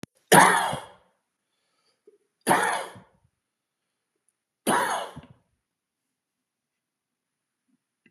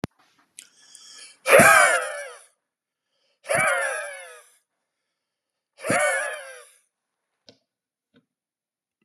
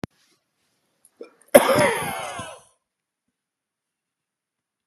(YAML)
three_cough_length: 8.1 s
three_cough_amplitude: 27609
three_cough_signal_mean_std_ratio: 0.27
exhalation_length: 9.0 s
exhalation_amplitude: 30782
exhalation_signal_mean_std_ratio: 0.32
cough_length: 4.9 s
cough_amplitude: 32768
cough_signal_mean_std_ratio: 0.25
survey_phase: beta (2021-08-13 to 2022-03-07)
age: 45-64
gender: Male
wearing_mask: 'No'
symptom_none: true
smoker_status: Never smoked
respiratory_condition_asthma: false
respiratory_condition_other: false
recruitment_source: REACT
submission_delay: 2 days
covid_test_result: Negative
covid_test_method: RT-qPCR
influenza_a_test_result: Negative
influenza_b_test_result: Negative